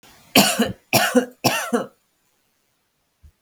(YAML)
three_cough_length: 3.4 s
three_cough_amplitude: 32768
three_cough_signal_mean_std_ratio: 0.4
survey_phase: beta (2021-08-13 to 2022-03-07)
age: 18-44
gender: Female
wearing_mask: 'No'
symptom_none: true
smoker_status: Current smoker (1 to 10 cigarettes per day)
respiratory_condition_asthma: false
respiratory_condition_other: false
recruitment_source: REACT
submission_delay: 3 days
covid_test_result: Negative
covid_test_method: RT-qPCR
influenza_a_test_result: Negative
influenza_b_test_result: Negative